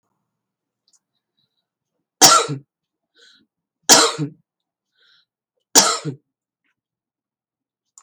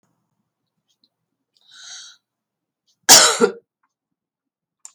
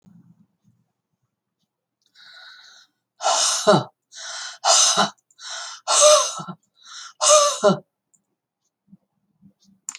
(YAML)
three_cough_length: 8.0 s
three_cough_amplitude: 32768
three_cough_signal_mean_std_ratio: 0.24
cough_length: 4.9 s
cough_amplitude: 32768
cough_signal_mean_std_ratio: 0.21
exhalation_length: 10.0 s
exhalation_amplitude: 29368
exhalation_signal_mean_std_ratio: 0.38
survey_phase: beta (2021-08-13 to 2022-03-07)
age: 65+
gender: Female
wearing_mask: 'No'
symptom_none: true
smoker_status: Never smoked
respiratory_condition_asthma: false
respiratory_condition_other: false
recruitment_source: REACT
submission_delay: 1 day
covid_test_result: Negative
covid_test_method: RT-qPCR